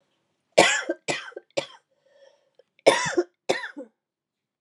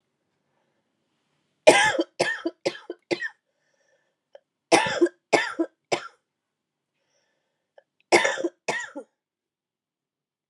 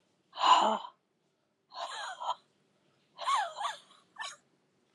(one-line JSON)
{"cough_length": "4.6 s", "cough_amplitude": 31940, "cough_signal_mean_std_ratio": 0.32, "three_cough_length": "10.5 s", "three_cough_amplitude": 32765, "three_cough_signal_mean_std_ratio": 0.29, "exhalation_length": "4.9 s", "exhalation_amplitude": 9837, "exhalation_signal_mean_std_ratio": 0.38, "survey_phase": "beta (2021-08-13 to 2022-03-07)", "age": "45-64", "gender": "Female", "wearing_mask": "No", "symptom_cough_any": true, "symptom_runny_or_blocked_nose": true, "symptom_shortness_of_breath": true, "symptom_fatigue": true, "symptom_headache": true, "symptom_onset": "4 days", "smoker_status": "Never smoked", "respiratory_condition_asthma": false, "respiratory_condition_other": false, "recruitment_source": "Test and Trace", "submission_delay": "2 days", "covid_test_result": "Positive", "covid_test_method": "ePCR"}